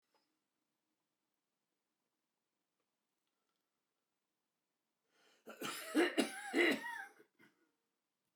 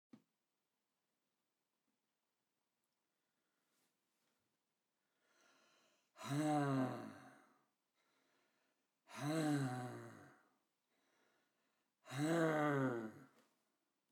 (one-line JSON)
{"cough_length": "8.4 s", "cough_amplitude": 3545, "cough_signal_mean_std_ratio": 0.26, "exhalation_length": "14.1 s", "exhalation_amplitude": 1789, "exhalation_signal_mean_std_ratio": 0.36, "survey_phase": "beta (2021-08-13 to 2022-03-07)", "age": "65+", "gender": "Male", "wearing_mask": "No", "symptom_cough_any": true, "symptom_abdominal_pain": true, "symptom_headache": true, "smoker_status": "Never smoked", "respiratory_condition_asthma": true, "respiratory_condition_other": false, "recruitment_source": "REACT", "submission_delay": "1 day", "covid_test_result": "Negative", "covid_test_method": "RT-qPCR"}